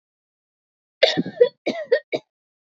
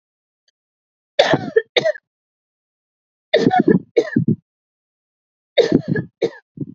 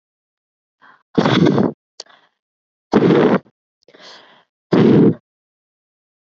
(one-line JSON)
{"cough_length": "2.7 s", "cough_amplitude": 27351, "cough_signal_mean_std_ratio": 0.31, "three_cough_length": "6.7 s", "three_cough_amplitude": 32768, "three_cough_signal_mean_std_ratio": 0.36, "exhalation_length": "6.2 s", "exhalation_amplitude": 29228, "exhalation_signal_mean_std_ratio": 0.4, "survey_phase": "beta (2021-08-13 to 2022-03-07)", "age": "18-44", "gender": "Female", "wearing_mask": "No", "symptom_fatigue": true, "symptom_change_to_sense_of_smell_or_taste": true, "symptom_loss_of_taste": true, "symptom_onset": "10 days", "smoker_status": "Never smoked", "respiratory_condition_asthma": false, "respiratory_condition_other": false, "recruitment_source": "Test and Trace", "submission_delay": "3 days", "covid_test_result": "Positive", "covid_test_method": "RT-qPCR"}